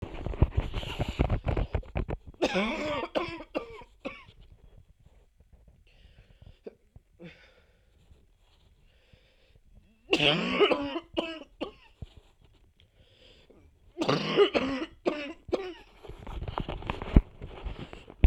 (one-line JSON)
{"three_cough_length": "18.3 s", "three_cough_amplitude": 25813, "three_cough_signal_mean_std_ratio": 0.4, "survey_phase": "beta (2021-08-13 to 2022-03-07)", "age": "18-44", "gender": "Female", "wearing_mask": "No", "symptom_cough_any": true, "symptom_runny_or_blocked_nose": true, "symptom_sore_throat": true, "symptom_abdominal_pain": true, "symptom_fatigue": true, "symptom_headache": true, "symptom_change_to_sense_of_smell_or_taste": true, "symptom_loss_of_taste": true, "symptom_onset": "3 days", "smoker_status": "Current smoker (e-cigarettes or vapes only)", "respiratory_condition_asthma": false, "respiratory_condition_other": false, "recruitment_source": "Test and Trace", "submission_delay": "2 days", "covid_test_result": "Positive", "covid_test_method": "RT-qPCR", "covid_ct_value": 19.5, "covid_ct_gene": "N gene"}